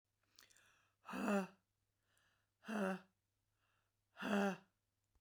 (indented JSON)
{
  "exhalation_length": "5.2 s",
  "exhalation_amplitude": 1622,
  "exhalation_signal_mean_std_ratio": 0.37,
  "survey_phase": "beta (2021-08-13 to 2022-03-07)",
  "age": "45-64",
  "gender": "Female",
  "wearing_mask": "No",
  "symptom_none": true,
  "smoker_status": "Ex-smoker",
  "respiratory_condition_asthma": false,
  "respiratory_condition_other": false,
  "recruitment_source": "REACT",
  "submission_delay": "1 day",
  "covid_test_result": "Negative",
  "covid_test_method": "RT-qPCR"
}